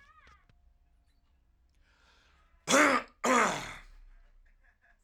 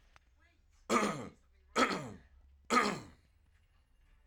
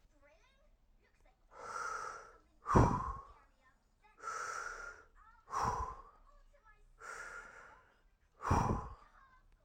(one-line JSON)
{"cough_length": "5.0 s", "cough_amplitude": 9092, "cough_signal_mean_std_ratio": 0.32, "three_cough_length": "4.3 s", "three_cough_amplitude": 5913, "three_cough_signal_mean_std_ratio": 0.37, "exhalation_length": "9.6 s", "exhalation_amplitude": 6031, "exhalation_signal_mean_std_ratio": 0.38, "survey_phase": "alpha (2021-03-01 to 2021-08-12)", "age": "18-44", "gender": "Male", "wearing_mask": "No", "symptom_none": true, "smoker_status": "Never smoked", "respiratory_condition_asthma": false, "respiratory_condition_other": false, "recruitment_source": "REACT", "submission_delay": "1 day", "covid_test_result": "Negative", "covid_test_method": "RT-qPCR"}